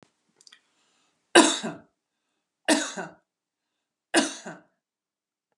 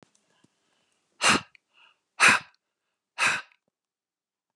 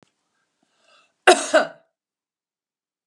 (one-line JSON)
{"three_cough_length": "5.6 s", "three_cough_amplitude": 28377, "three_cough_signal_mean_std_ratio": 0.25, "exhalation_length": "4.6 s", "exhalation_amplitude": 19169, "exhalation_signal_mean_std_ratio": 0.27, "cough_length": "3.1 s", "cough_amplitude": 32394, "cough_signal_mean_std_ratio": 0.22, "survey_phase": "beta (2021-08-13 to 2022-03-07)", "age": "65+", "gender": "Female", "wearing_mask": "No", "symptom_none": true, "smoker_status": "Ex-smoker", "respiratory_condition_asthma": false, "respiratory_condition_other": false, "recruitment_source": "REACT", "submission_delay": "2 days", "covid_test_result": "Negative", "covid_test_method": "RT-qPCR"}